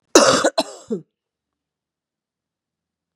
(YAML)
cough_length: 3.2 s
cough_amplitude: 32768
cough_signal_mean_std_ratio: 0.28
survey_phase: beta (2021-08-13 to 2022-03-07)
age: 45-64
gender: Female
wearing_mask: 'No'
symptom_runny_or_blocked_nose: true
symptom_onset: 3 days
smoker_status: Never smoked
respiratory_condition_asthma: false
respiratory_condition_other: false
recruitment_source: Test and Trace
submission_delay: 2 days
covid_test_result: Positive
covid_test_method: RT-qPCR
covid_ct_value: 19.1
covid_ct_gene: ORF1ab gene
covid_ct_mean: 19.6
covid_viral_load: 380000 copies/ml
covid_viral_load_category: Low viral load (10K-1M copies/ml)